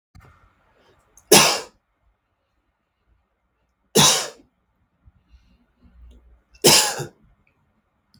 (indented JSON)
{
  "three_cough_length": "8.2 s",
  "three_cough_amplitude": 32768,
  "three_cough_signal_mean_std_ratio": 0.26,
  "survey_phase": "beta (2021-08-13 to 2022-03-07)",
  "age": "45-64",
  "gender": "Male",
  "wearing_mask": "No",
  "symptom_none": true,
  "smoker_status": "Never smoked",
  "respiratory_condition_asthma": false,
  "respiratory_condition_other": false,
  "recruitment_source": "REACT",
  "submission_delay": "4 days",
  "covid_test_result": "Negative",
  "covid_test_method": "RT-qPCR",
  "influenza_a_test_result": "Negative",
  "influenza_b_test_result": "Negative"
}